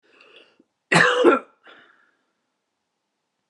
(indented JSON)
{
  "three_cough_length": "3.5 s",
  "three_cough_amplitude": 26810,
  "three_cough_signal_mean_std_ratio": 0.3,
  "survey_phase": "beta (2021-08-13 to 2022-03-07)",
  "age": "18-44",
  "gender": "Female",
  "wearing_mask": "No",
  "symptom_none": true,
  "smoker_status": "Ex-smoker",
  "respiratory_condition_asthma": false,
  "respiratory_condition_other": false,
  "recruitment_source": "REACT",
  "submission_delay": "2 days",
  "covid_test_result": "Negative",
  "covid_test_method": "RT-qPCR"
}